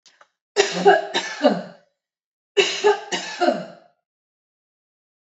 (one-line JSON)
{"cough_length": "5.2 s", "cough_amplitude": 30681, "cough_signal_mean_std_ratio": 0.41, "survey_phase": "alpha (2021-03-01 to 2021-08-12)", "age": "45-64", "gender": "Female", "wearing_mask": "No", "symptom_none": true, "smoker_status": "Ex-smoker", "respiratory_condition_asthma": true, "respiratory_condition_other": false, "recruitment_source": "REACT", "submission_delay": "2 days", "covid_test_result": "Negative", "covid_test_method": "RT-qPCR"}